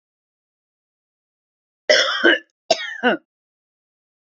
cough_length: 4.4 s
cough_amplitude: 28923
cough_signal_mean_std_ratio: 0.31
survey_phase: beta (2021-08-13 to 2022-03-07)
age: 45-64
gender: Female
wearing_mask: 'No'
symptom_sore_throat: true
symptom_onset: 12 days
smoker_status: Ex-smoker
respiratory_condition_asthma: false
respiratory_condition_other: false
recruitment_source: REACT
submission_delay: 0 days
covid_test_result: Negative
covid_test_method: RT-qPCR
influenza_a_test_result: Negative
influenza_b_test_result: Negative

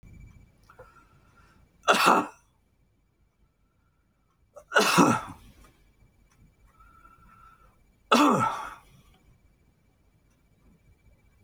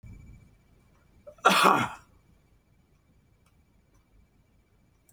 three_cough_length: 11.4 s
three_cough_amplitude: 19452
three_cough_signal_mean_std_ratio: 0.29
cough_length: 5.1 s
cough_amplitude: 18495
cough_signal_mean_std_ratio: 0.25
survey_phase: alpha (2021-03-01 to 2021-08-12)
age: 65+
gender: Male
wearing_mask: 'No'
symptom_none: true
smoker_status: Never smoked
respiratory_condition_asthma: false
respiratory_condition_other: false
recruitment_source: REACT
submission_delay: 2 days
covid_test_result: Negative
covid_test_method: RT-qPCR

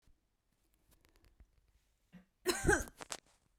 cough_length: 3.6 s
cough_amplitude: 5315
cough_signal_mean_std_ratio: 0.26
survey_phase: beta (2021-08-13 to 2022-03-07)
age: 18-44
gender: Female
wearing_mask: 'No'
symptom_shortness_of_breath: true
symptom_sore_throat: true
symptom_fatigue: true
symptom_other: true
symptom_onset: 4 days
smoker_status: Never smoked
respiratory_condition_asthma: false
respiratory_condition_other: false
recruitment_source: Test and Trace
submission_delay: 2 days
covid_test_result: Positive
covid_test_method: RT-qPCR
covid_ct_value: 27.6
covid_ct_gene: ORF1ab gene
covid_ct_mean: 28.0
covid_viral_load: 640 copies/ml
covid_viral_load_category: Minimal viral load (< 10K copies/ml)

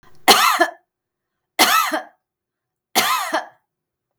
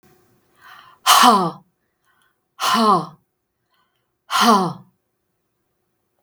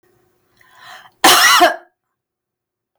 three_cough_length: 4.2 s
three_cough_amplitude: 32768
three_cough_signal_mean_std_ratio: 0.42
exhalation_length: 6.2 s
exhalation_amplitude: 32768
exhalation_signal_mean_std_ratio: 0.37
cough_length: 3.0 s
cough_amplitude: 32768
cough_signal_mean_std_ratio: 0.36
survey_phase: beta (2021-08-13 to 2022-03-07)
age: 65+
gender: Female
wearing_mask: 'No'
symptom_none: true
symptom_onset: 4 days
smoker_status: Ex-smoker
respiratory_condition_asthma: false
respiratory_condition_other: false
recruitment_source: REACT
submission_delay: 2 days
covid_test_result: Negative
covid_test_method: RT-qPCR
influenza_a_test_result: Negative
influenza_b_test_result: Negative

